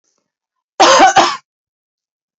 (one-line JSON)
{"cough_length": "2.4 s", "cough_amplitude": 32532, "cough_signal_mean_std_ratio": 0.4, "survey_phase": "beta (2021-08-13 to 2022-03-07)", "age": "45-64", "gender": "Female", "wearing_mask": "No", "symptom_runny_or_blocked_nose": true, "smoker_status": "Never smoked", "respiratory_condition_asthma": false, "respiratory_condition_other": false, "recruitment_source": "REACT", "submission_delay": "6 days", "covid_test_result": "Negative", "covid_test_method": "RT-qPCR", "covid_ct_value": 47.0, "covid_ct_gene": "N gene"}